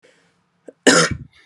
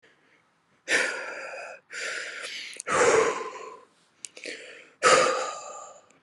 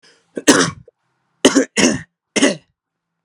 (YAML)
cough_length: 1.5 s
cough_amplitude: 32766
cough_signal_mean_std_ratio: 0.34
exhalation_length: 6.2 s
exhalation_amplitude: 15690
exhalation_signal_mean_std_ratio: 0.48
three_cough_length: 3.2 s
three_cough_amplitude: 32768
three_cough_signal_mean_std_ratio: 0.39
survey_phase: beta (2021-08-13 to 2022-03-07)
age: 18-44
gender: Male
wearing_mask: 'No'
symptom_cough_any: true
smoker_status: Never smoked
respiratory_condition_asthma: false
respiratory_condition_other: false
recruitment_source: REACT
submission_delay: 1 day
covid_test_result: Negative
covid_test_method: RT-qPCR